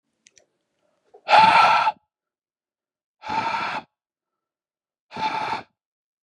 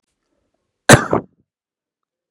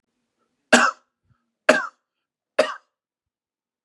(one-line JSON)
{"exhalation_length": "6.2 s", "exhalation_amplitude": 25320, "exhalation_signal_mean_std_ratio": 0.36, "cough_length": "2.3 s", "cough_amplitude": 32768, "cough_signal_mean_std_ratio": 0.21, "three_cough_length": "3.8 s", "three_cough_amplitude": 32309, "three_cough_signal_mean_std_ratio": 0.24, "survey_phase": "beta (2021-08-13 to 2022-03-07)", "age": "18-44", "gender": "Male", "wearing_mask": "No", "symptom_none": true, "smoker_status": "Never smoked", "respiratory_condition_asthma": false, "respiratory_condition_other": false, "recruitment_source": "REACT", "submission_delay": "6 days", "covid_test_result": "Negative", "covid_test_method": "RT-qPCR", "influenza_a_test_result": "Negative", "influenza_b_test_result": "Negative"}